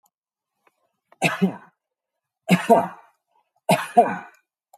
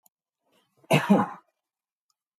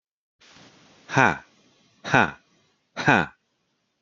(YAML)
three_cough_length: 4.8 s
three_cough_amplitude: 27110
three_cough_signal_mean_std_ratio: 0.32
cough_length: 2.4 s
cough_amplitude: 15252
cough_signal_mean_std_ratio: 0.29
exhalation_length: 4.0 s
exhalation_amplitude: 31791
exhalation_signal_mean_std_ratio: 0.27
survey_phase: beta (2021-08-13 to 2022-03-07)
age: 45-64
gender: Male
wearing_mask: 'No'
symptom_none: true
smoker_status: Ex-smoker
respiratory_condition_asthma: false
respiratory_condition_other: false
recruitment_source: REACT
submission_delay: 2 days
covid_test_result: Negative
covid_test_method: RT-qPCR